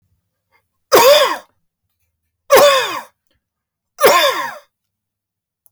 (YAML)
three_cough_length: 5.7 s
three_cough_amplitude: 32767
three_cough_signal_mean_std_ratio: 0.39
survey_phase: beta (2021-08-13 to 2022-03-07)
age: 65+
gender: Male
wearing_mask: 'No'
symptom_none: true
smoker_status: Never smoked
respiratory_condition_asthma: false
respiratory_condition_other: false
recruitment_source: REACT
submission_delay: 1 day
covid_test_result: Negative
covid_test_method: RT-qPCR